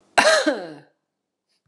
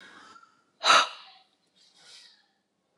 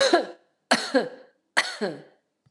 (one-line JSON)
{"cough_length": "1.7 s", "cough_amplitude": 29203, "cough_signal_mean_std_ratio": 0.4, "exhalation_length": "3.0 s", "exhalation_amplitude": 18175, "exhalation_signal_mean_std_ratio": 0.24, "three_cough_length": "2.5 s", "three_cough_amplitude": 25650, "three_cough_signal_mean_std_ratio": 0.43, "survey_phase": "beta (2021-08-13 to 2022-03-07)", "age": "18-44", "gender": "Female", "wearing_mask": "No", "symptom_none": true, "smoker_status": "Ex-smoker", "respiratory_condition_asthma": false, "respiratory_condition_other": false, "recruitment_source": "REACT", "submission_delay": "1 day", "covid_test_result": "Negative", "covid_test_method": "RT-qPCR"}